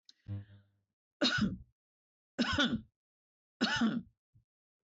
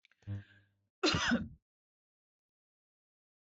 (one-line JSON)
{"three_cough_length": "4.9 s", "three_cough_amplitude": 3965, "three_cough_signal_mean_std_ratio": 0.43, "cough_length": "3.4 s", "cough_amplitude": 3423, "cough_signal_mean_std_ratio": 0.32, "survey_phase": "beta (2021-08-13 to 2022-03-07)", "age": "65+", "gender": "Female", "wearing_mask": "No", "symptom_none": true, "smoker_status": "Ex-smoker", "respiratory_condition_asthma": false, "respiratory_condition_other": false, "recruitment_source": "REACT", "submission_delay": "3 days", "covid_test_result": "Negative", "covid_test_method": "RT-qPCR"}